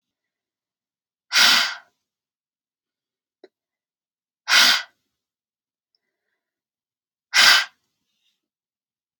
exhalation_length: 9.2 s
exhalation_amplitude: 27693
exhalation_signal_mean_std_ratio: 0.26
survey_phase: alpha (2021-03-01 to 2021-08-12)
age: 18-44
gender: Female
wearing_mask: 'No'
symptom_none: true
smoker_status: Never smoked
respiratory_condition_asthma: false
respiratory_condition_other: false
recruitment_source: REACT
submission_delay: 1 day
covid_test_result: Negative
covid_test_method: RT-qPCR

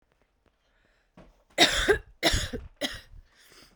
cough_length: 3.8 s
cough_amplitude: 17444
cough_signal_mean_std_ratio: 0.36
survey_phase: beta (2021-08-13 to 2022-03-07)
age: 18-44
gender: Female
wearing_mask: 'No'
symptom_cough_any: true
symptom_runny_or_blocked_nose: true
symptom_sore_throat: true
symptom_abdominal_pain: true
symptom_fatigue: true
symptom_fever_high_temperature: true
symptom_headache: true
symptom_change_to_sense_of_smell_or_taste: true
symptom_loss_of_taste: true
symptom_other: true
symptom_onset: 2 days
smoker_status: Current smoker (11 or more cigarettes per day)
respiratory_condition_asthma: false
respiratory_condition_other: false
recruitment_source: Test and Trace
submission_delay: 2 days
covid_test_result: Positive
covid_test_method: RT-qPCR
covid_ct_value: 23.0
covid_ct_gene: ORF1ab gene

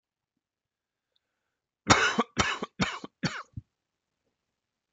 cough_length: 4.9 s
cough_amplitude: 21575
cough_signal_mean_std_ratio: 0.29
survey_phase: beta (2021-08-13 to 2022-03-07)
age: 45-64
gender: Male
wearing_mask: 'No'
symptom_cough_any: true
symptom_runny_or_blocked_nose: true
symptom_fatigue: true
symptom_headache: true
symptom_onset: 4 days
smoker_status: Never smoked
respiratory_condition_asthma: false
respiratory_condition_other: false
recruitment_source: Test and Trace
submission_delay: 1 day
covid_test_result: Negative
covid_test_method: RT-qPCR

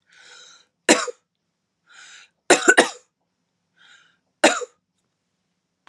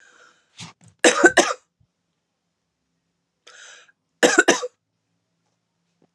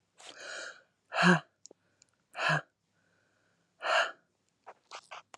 three_cough_length: 5.9 s
three_cough_amplitude: 32767
three_cough_signal_mean_std_ratio: 0.24
cough_length: 6.1 s
cough_amplitude: 32767
cough_signal_mean_std_ratio: 0.25
exhalation_length: 5.4 s
exhalation_amplitude: 10697
exhalation_signal_mean_std_ratio: 0.32
survey_phase: alpha (2021-03-01 to 2021-08-12)
age: 18-44
gender: Female
wearing_mask: 'No'
symptom_none: true
smoker_status: Ex-smoker
respiratory_condition_asthma: false
respiratory_condition_other: false
recruitment_source: REACT
submission_delay: 1 day
covid_test_result: Negative
covid_test_method: RT-qPCR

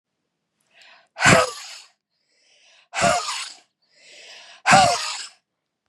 exhalation_length: 5.9 s
exhalation_amplitude: 30944
exhalation_signal_mean_std_ratio: 0.35
survey_phase: beta (2021-08-13 to 2022-03-07)
age: 18-44
gender: Female
wearing_mask: 'No'
symptom_cough_any: true
symptom_headache: true
smoker_status: Ex-smoker
respiratory_condition_asthma: false
respiratory_condition_other: false
recruitment_source: REACT
submission_delay: 0 days
covid_test_result: Negative
covid_test_method: RT-qPCR
influenza_a_test_result: Negative
influenza_b_test_result: Negative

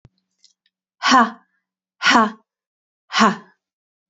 exhalation_length: 4.1 s
exhalation_amplitude: 28463
exhalation_signal_mean_std_ratio: 0.33
survey_phase: beta (2021-08-13 to 2022-03-07)
age: 45-64
gender: Female
wearing_mask: 'No'
symptom_runny_or_blocked_nose: true
symptom_fatigue: true
symptom_headache: true
symptom_other: true
smoker_status: Never smoked
respiratory_condition_asthma: false
respiratory_condition_other: false
recruitment_source: Test and Trace
submission_delay: 0 days
covid_test_result: Negative
covid_test_method: RT-qPCR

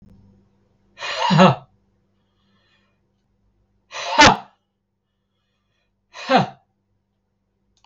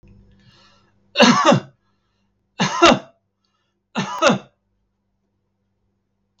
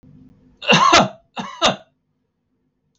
exhalation_length: 7.9 s
exhalation_amplitude: 32768
exhalation_signal_mean_std_ratio: 0.26
three_cough_length: 6.4 s
three_cough_amplitude: 32768
three_cough_signal_mean_std_ratio: 0.32
cough_length: 3.0 s
cough_amplitude: 32768
cough_signal_mean_std_ratio: 0.37
survey_phase: beta (2021-08-13 to 2022-03-07)
age: 65+
gender: Male
wearing_mask: 'No'
symptom_none: true
smoker_status: Never smoked
respiratory_condition_asthma: false
respiratory_condition_other: false
recruitment_source: REACT
submission_delay: 1 day
covid_test_result: Negative
covid_test_method: RT-qPCR
influenza_a_test_result: Unknown/Void
influenza_b_test_result: Unknown/Void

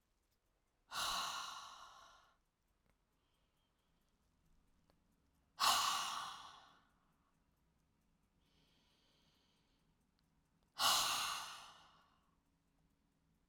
exhalation_length: 13.5 s
exhalation_amplitude: 3366
exhalation_signal_mean_std_ratio: 0.32
survey_phase: alpha (2021-03-01 to 2021-08-12)
age: 65+
gender: Female
wearing_mask: 'No'
symptom_abdominal_pain: true
symptom_fatigue: true
symptom_headache: true
symptom_onset: 12 days
smoker_status: Ex-smoker
respiratory_condition_asthma: false
respiratory_condition_other: false
recruitment_source: REACT
submission_delay: 2 days
covid_test_result: Negative
covid_test_method: RT-qPCR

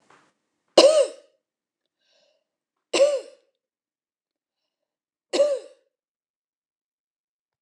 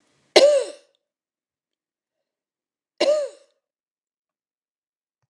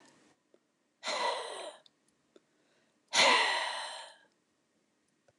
three_cough_length: 7.6 s
three_cough_amplitude: 29200
three_cough_signal_mean_std_ratio: 0.25
cough_length: 5.3 s
cough_amplitude: 29203
cough_signal_mean_std_ratio: 0.25
exhalation_length: 5.4 s
exhalation_amplitude: 8757
exhalation_signal_mean_std_ratio: 0.37
survey_phase: beta (2021-08-13 to 2022-03-07)
age: 65+
gender: Female
wearing_mask: 'No'
symptom_runny_or_blocked_nose: true
symptom_shortness_of_breath: true
smoker_status: Current smoker (e-cigarettes or vapes only)
respiratory_condition_asthma: false
respiratory_condition_other: false
recruitment_source: REACT
submission_delay: 2 days
covid_test_result: Negative
covid_test_method: RT-qPCR
influenza_a_test_result: Negative
influenza_b_test_result: Negative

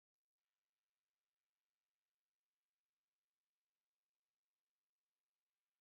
three_cough_length: 5.8 s
three_cough_amplitude: 3
three_cough_signal_mean_std_ratio: 0.2
survey_phase: beta (2021-08-13 to 2022-03-07)
age: 45-64
gender: Male
wearing_mask: 'No'
symptom_sore_throat: true
symptom_headache: true
symptom_onset: 13 days
smoker_status: Ex-smoker
respiratory_condition_asthma: false
respiratory_condition_other: true
recruitment_source: REACT
submission_delay: 2 days
covid_test_result: Negative
covid_test_method: RT-qPCR
influenza_a_test_result: Negative
influenza_b_test_result: Negative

